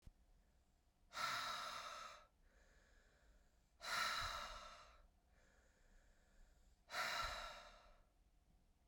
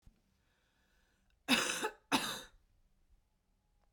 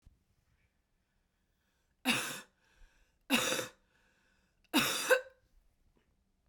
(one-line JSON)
{"exhalation_length": "8.9 s", "exhalation_amplitude": 899, "exhalation_signal_mean_std_ratio": 0.5, "cough_length": "3.9 s", "cough_amplitude": 4652, "cough_signal_mean_std_ratio": 0.32, "three_cough_length": "6.5 s", "three_cough_amplitude": 7236, "three_cough_signal_mean_std_ratio": 0.31, "survey_phase": "beta (2021-08-13 to 2022-03-07)", "age": "45-64", "gender": "Female", "wearing_mask": "No", "symptom_cough_any": true, "symptom_fatigue": true, "smoker_status": "Never smoked", "respiratory_condition_asthma": true, "respiratory_condition_other": false, "recruitment_source": "Test and Trace", "submission_delay": "1 day", "covid_test_result": "Positive", "covid_test_method": "RT-qPCR", "covid_ct_value": 10.7, "covid_ct_gene": "S gene"}